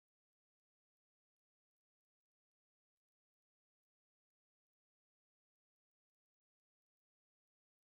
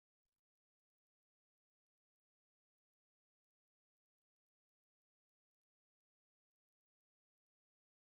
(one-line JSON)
{"exhalation_length": "8.0 s", "exhalation_amplitude": 1, "exhalation_signal_mean_std_ratio": 0.02, "three_cough_length": "8.2 s", "three_cough_amplitude": 2, "three_cough_signal_mean_std_ratio": 0.05, "survey_phase": "beta (2021-08-13 to 2022-03-07)", "age": "65+", "gender": "Male", "wearing_mask": "No", "symptom_cough_any": true, "smoker_status": "Never smoked", "respiratory_condition_asthma": false, "respiratory_condition_other": false, "recruitment_source": "Test and Trace", "submission_delay": "2 days", "covid_test_result": "Positive", "covid_test_method": "LFT"}